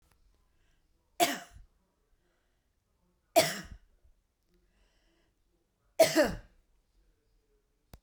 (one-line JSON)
{"three_cough_length": "8.0 s", "three_cough_amplitude": 11285, "three_cough_signal_mean_std_ratio": 0.22, "survey_phase": "beta (2021-08-13 to 2022-03-07)", "age": "45-64", "gender": "Female", "wearing_mask": "No", "symptom_runny_or_blocked_nose": true, "symptom_fatigue": true, "symptom_headache": true, "symptom_onset": "7 days", "smoker_status": "Never smoked", "respiratory_condition_asthma": false, "respiratory_condition_other": false, "recruitment_source": "REACT", "submission_delay": "0 days", "covid_test_result": "Negative", "covid_test_method": "RT-qPCR"}